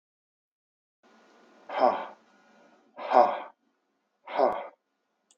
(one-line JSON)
{"exhalation_length": "5.4 s", "exhalation_amplitude": 18874, "exhalation_signal_mean_std_ratio": 0.3, "survey_phase": "beta (2021-08-13 to 2022-03-07)", "age": "65+", "gender": "Male", "wearing_mask": "No", "symptom_none": true, "smoker_status": "Never smoked", "respiratory_condition_asthma": false, "respiratory_condition_other": false, "recruitment_source": "REACT", "submission_delay": "3 days", "covid_test_result": "Negative", "covid_test_method": "RT-qPCR", "influenza_a_test_result": "Negative", "influenza_b_test_result": "Negative"}